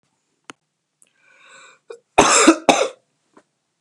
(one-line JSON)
{"cough_length": "3.8 s", "cough_amplitude": 32768, "cough_signal_mean_std_ratio": 0.3, "survey_phase": "beta (2021-08-13 to 2022-03-07)", "age": "18-44", "gender": "Male", "wearing_mask": "No", "symptom_cough_any": true, "symptom_fatigue": true, "smoker_status": "Current smoker (e-cigarettes or vapes only)", "respiratory_condition_asthma": false, "respiratory_condition_other": false, "recruitment_source": "Test and Trace", "submission_delay": "1 day", "covid_test_result": "Negative", "covid_test_method": "RT-qPCR"}